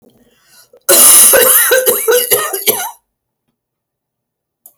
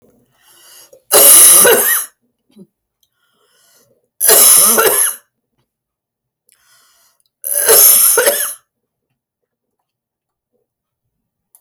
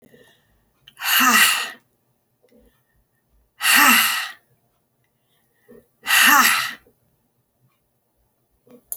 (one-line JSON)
{"cough_length": "4.8 s", "cough_amplitude": 32768, "cough_signal_mean_std_ratio": 0.52, "three_cough_length": "11.6 s", "three_cough_amplitude": 32768, "three_cough_signal_mean_std_ratio": 0.41, "exhalation_length": "9.0 s", "exhalation_amplitude": 30064, "exhalation_signal_mean_std_ratio": 0.37, "survey_phase": "beta (2021-08-13 to 2022-03-07)", "age": "45-64", "gender": "Female", "wearing_mask": "No", "symptom_none": true, "smoker_status": "Never smoked", "respiratory_condition_asthma": false, "respiratory_condition_other": false, "recruitment_source": "REACT", "submission_delay": "3 days", "covid_test_result": "Negative", "covid_test_method": "RT-qPCR"}